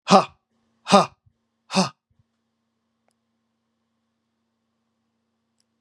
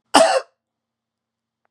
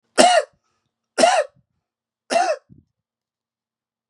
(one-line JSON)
{"exhalation_length": "5.8 s", "exhalation_amplitude": 32767, "exhalation_signal_mean_std_ratio": 0.19, "cough_length": "1.7 s", "cough_amplitude": 32767, "cough_signal_mean_std_ratio": 0.3, "three_cough_length": "4.1 s", "three_cough_amplitude": 32767, "three_cough_signal_mean_std_ratio": 0.34, "survey_phase": "beta (2021-08-13 to 2022-03-07)", "age": "45-64", "gender": "Male", "wearing_mask": "No", "symptom_cough_any": true, "symptom_runny_or_blocked_nose": true, "smoker_status": "Never smoked", "respiratory_condition_asthma": false, "respiratory_condition_other": false, "recruitment_source": "Test and Trace", "submission_delay": "2 days", "covid_test_result": "Positive", "covid_test_method": "LFT"}